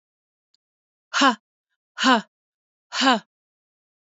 {"exhalation_length": "4.1 s", "exhalation_amplitude": 21507, "exhalation_signal_mean_std_ratio": 0.29, "survey_phase": "beta (2021-08-13 to 2022-03-07)", "age": "45-64", "gender": "Female", "wearing_mask": "No", "symptom_cough_any": true, "symptom_runny_or_blocked_nose": true, "symptom_shortness_of_breath": true, "symptom_fatigue": true, "symptom_other": true, "symptom_onset": "6 days", "smoker_status": "Ex-smoker", "respiratory_condition_asthma": false, "respiratory_condition_other": false, "recruitment_source": "Test and Trace", "submission_delay": "2 days", "covid_test_result": "Positive", "covid_test_method": "RT-qPCR", "covid_ct_value": 16.4, "covid_ct_gene": "ORF1ab gene", "covid_ct_mean": 16.6, "covid_viral_load": "3700000 copies/ml", "covid_viral_load_category": "High viral load (>1M copies/ml)"}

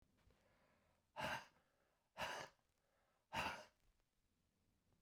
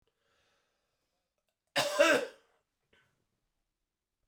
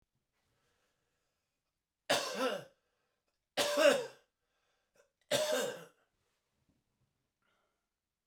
{"exhalation_length": "5.0 s", "exhalation_amplitude": 759, "exhalation_signal_mean_std_ratio": 0.35, "cough_length": "4.3 s", "cough_amplitude": 8593, "cough_signal_mean_std_ratio": 0.25, "three_cough_length": "8.3 s", "three_cough_amplitude": 6278, "three_cough_signal_mean_std_ratio": 0.31, "survey_phase": "beta (2021-08-13 to 2022-03-07)", "age": "65+", "gender": "Male", "wearing_mask": "No", "symptom_cough_any": true, "smoker_status": "Never smoked", "respiratory_condition_asthma": true, "respiratory_condition_other": false, "recruitment_source": "REACT", "submission_delay": "1 day", "covid_test_result": "Negative", "covid_test_method": "RT-qPCR"}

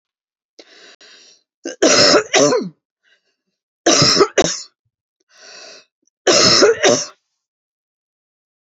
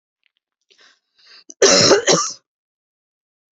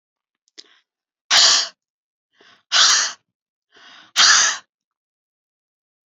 {"three_cough_length": "8.6 s", "three_cough_amplitude": 32768, "three_cough_signal_mean_std_ratio": 0.41, "cough_length": "3.6 s", "cough_amplitude": 32767, "cough_signal_mean_std_ratio": 0.34, "exhalation_length": "6.1 s", "exhalation_amplitude": 31792, "exhalation_signal_mean_std_ratio": 0.35, "survey_phase": "beta (2021-08-13 to 2022-03-07)", "age": "18-44", "gender": "Female", "wearing_mask": "No", "symptom_runny_or_blocked_nose": true, "symptom_sore_throat": true, "symptom_headache": true, "smoker_status": "Never smoked", "respiratory_condition_asthma": true, "respiratory_condition_other": false, "recruitment_source": "Test and Trace", "submission_delay": "2 days", "covid_test_result": "Positive", "covid_test_method": "RT-qPCR", "covid_ct_value": 28.9, "covid_ct_gene": "ORF1ab gene", "covid_ct_mean": 29.0, "covid_viral_load": "300 copies/ml", "covid_viral_load_category": "Minimal viral load (< 10K copies/ml)"}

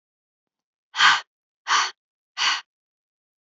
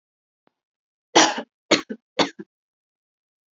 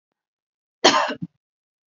{"exhalation_length": "3.5 s", "exhalation_amplitude": 24201, "exhalation_signal_mean_std_ratio": 0.33, "three_cough_length": "3.6 s", "three_cough_amplitude": 28571, "three_cough_signal_mean_std_ratio": 0.24, "cough_length": "1.9 s", "cough_amplitude": 32767, "cough_signal_mean_std_ratio": 0.29, "survey_phase": "alpha (2021-03-01 to 2021-08-12)", "age": "18-44", "gender": "Female", "wearing_mask": "No", "symptom_none": true, "smoker_status": "Never smoked", "respiratory_condition_asthma": false, "respiratory_condition_other": false, "recruitment_source": "REACT", "submission_delay": "1 day", "covid_test_result": "Negative", "covid_test_method": "RT-qPCR"}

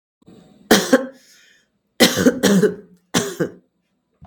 {"three_cough_length": "4.3 s", "three_cough_amplitude": 32766, "three_cough_signal_mean_std_ratio": 0.41, "survey_phase": "beta (2021-08-13 to 2022-03-07)", "age": "45-64", "gender": "Female", "wearing_mask": "No", "symptom_none": true, "smoker_status": "Ex-smoker", "respiratory_condition_asthma": false, "respiratory_condition_other": false, "recruitment_source": "REACT", "submission_delay": "1 day", "covid_test_result": "Negative", "covid_test_method": "RT-qPCR"}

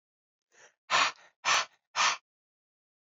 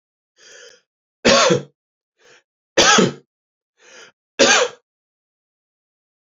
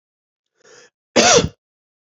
{"exhalation_length": "3.1 s", "exhalation_amplitude": 7761, "exhalation_signal_mean_std_ratio": 0.35, "three_cough_length": "6.3 s", "three_cough_amplitude": 31704, "three_cough_signal_mean_std_ratio": 0.33, "cough_length": "2.0 s", "cough_amplitude": 32768, "cough_signal_mean_std_ratio": 0.32, "survey_phase": "alpha (2021-03-01 to 2021-08-12)", "age": "18-44", "gender": "Male", "wearing_mask": "No", "symptom_headache": true, "symptom_loss_of_taste": true, "symptom_onset": "5 days", "smoker_status": "Never smoked", "respiratory_condition_asthma": false, "respiratory_condition_other": false, "recruitment_source": "Test and Trace", "submission_delay": "2 days", "covid_test_result": "Positive", "covid_test_method": "RT-qPCR"}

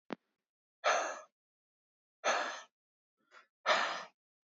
{"exhalation_length": "4.4 s", "exhalation_amplitude": 5795, "exhalation_signal_mean_std_ratio": 0.37, "survey_phase": "beta (2021-08-13 to 2022-03-07)", "age": "18-44", "gender": "Male", "wearing_mask": "No", "symptom_cough_any": true, "symptom_new_continuous_cough": true, "symptom_runny_or_blocked_nose": true, "symptom_sore_throat": true, "symptom_fatigue": true, "symptom_headache": true, "symptom_onset": "3 days", "smoker_status": "Never smoked", "respiratory_condition_asthma": false, "respiratory_condition_other": false, "recruitment_source": "Test and Trace", "submission_delay": "2 days", "covid_test_result": "Positive", "covid_test_method": "RT-qPCR", "covid_ct_value": 22.5, "covid_ct_gene": "ORF1ab gene", "covid_ct_mean": 23.1, "covid_viral_load": "26000 copies/ml", "covid_viral_load_category": "Low viral load (10K-1M copies/ml)"}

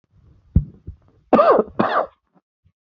{"cough_length": "2.9 s", "cough_amplitude": 27367, "cough_signal_mean_std_ratio": 0.37, "survey_phase": "beta (2021-08-13 to 2022-03-07)", "age": "18-44", "gender": "Male", "wearing_mask": "No", "symptom_shortness_of_breath": true, "symptom_sore_throat": true, "symptom_fatigue": true, "symptom_headache": true, "symptom_onset": "3 days", "smoker_status": "Never smoked", "respiratory_condition_asthma": false, "respiratory_condition_other": false, "recruitment_source": "Test and Trace", "submission_delay": "-2 days", "covid_test_result": "Positive", "covid_test_method": "RT-qPCR", "covid_ct_value": 22.4, "covid_ct_gene": "ORF1ab gene", "covid_ct_mean": 22.6, "covid_viral_load": "39000 copies/ml", "covid_viral_load_category": "Low viral load (10K-1M copies/ml)"}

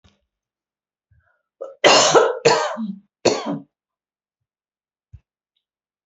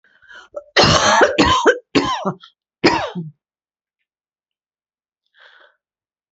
{"three_cough_length": "6.1 s", "three_cough_amplitude": 32767, "three_cough_signal_mean_std_ratio": 0.33, "cough_length": "6.3 s", "cough_amplitude": 29697, "cough_signal_mean_std_ratio": 0.41, "survey_phase": "beta (2021-08-13 to 2022-03-07)", "age": "65+", "gender": "Female", "wearing_mask": "No", "symptom_none": true, "symptom_onset": "6 days", "smoker_status": "Never smoked", "respiratory_condition_asthma": false, "respiratory_condition_other": false, "recruitment_source": "REACT", "submission_delay": "5 days", "covid_test_result": "Negative", "covid_test_method": "RT-qPCR", "influenza_a_test_result": "Unknown/Void", "influenza_b_test_result": "Unknown/Void"}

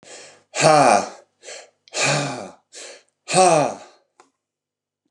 {"exhalation_length": "5.1 s", "exhalation_amplitude": 27886, "exhalation_signal_mean_std_ratio": 0.42, "survey_phase": "beta (2021-08-13 to 2022-03-07)", "age": "45-64", "gender": "Male", "wearing_mask": "No", "symptom_none": true, "symptom_onset": "12 days", "smoker_status": "Current smoker (11 or more cigarettes per day)", "respiratory_condition_asthma": false, "respiratory_condition_other": false, "recruitment_source": "REACT", "submission_delay": "1 day", "covid_test_result": "Negative", "covid_test_method": "RT-qPCR"}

